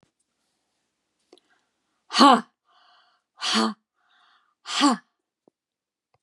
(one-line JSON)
{"exhalation_length": "6.2 s", "exhalation_amplitude": 28320, "exhalation_signal_mean_std_ratio": 0.25, "survey_phase": "beta (2021-08-13 to 2022-03-07)", "age": "65+", "gender": "Female", "wearing_mask": "No", "symptom_runny_or_blocked_nose": true, "smoker_status": "Ex-smoker", "respiratory_condition_asthma": false, "respiratory_condition_other": false, "recruitment_source": "REACT", "submission_delay": "1 day", "covid_test_result": "Negative", "covid_test_method": "RT-qPCR", "influenza_a_test_result": "Negative", "influenza_b_test_result": "Negative"}